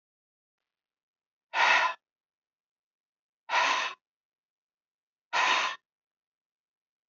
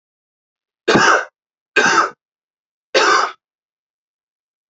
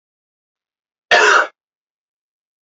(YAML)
exhalation_length: 7.1 s
exhalation_amplitude: 11240
exhalation_signal_mean_std_ratio: 0.33
three_cough_length: 4.7 s
three_cough_amplitude: 28657
three_cough_signal_mean_std_ratio: 0.38
cough_length: 2.6 s
cough_amplitude: 31714
cough_signal_mean_std_ratio: 0.3
survey_phase: beta (2021-08-13 to 2022-03-07)
age: 45-64
gender: Male
wearing_mask: 'No'
symptom_none: true
smoker_status: Current smoker (11 or more cigarettes per day)
respiratory_condition_asthma: false
respiratory_condition_other: false
recruitment_source: REACT
submission_delay: 2 days
covid_test_result: Negative
covid_test_method: RT-qPCR
influenza_a_test_result: Negative
influenza_b_test_result: Negative